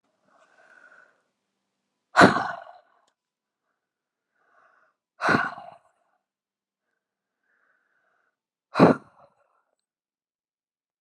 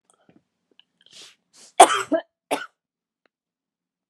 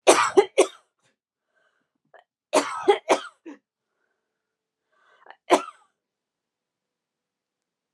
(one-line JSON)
{"exhalation_length": "11.0 s", "exhalation_amplitude": 30726, "exhalation_signal_mean_std_ratio": 0.19, "cough_length": "4.1 s", "cough_amplitude": 32768, "cough_signal_mean_std_ratio": 0.19, "three_cough_length": "7.9 s", "three_cough_amplitude": 28175, "three_cough_signal_mean_std_ratio": 0.24, "survey_phase": "alpha (2021-03-01 to 2021-08-12)", "age": "45-64", "gender": "Female", "wearing_mask": "No", "symptom_fatigue": true, "smoker_status": "Never smoked", "respiratory_condition_asthma": false, "respiratory_condition_other": false, "recruitment_source": "REACT", "submission_delay": "1 day", "covid_test_result": "Negative", "covid_test_method": "RT-qPCR"}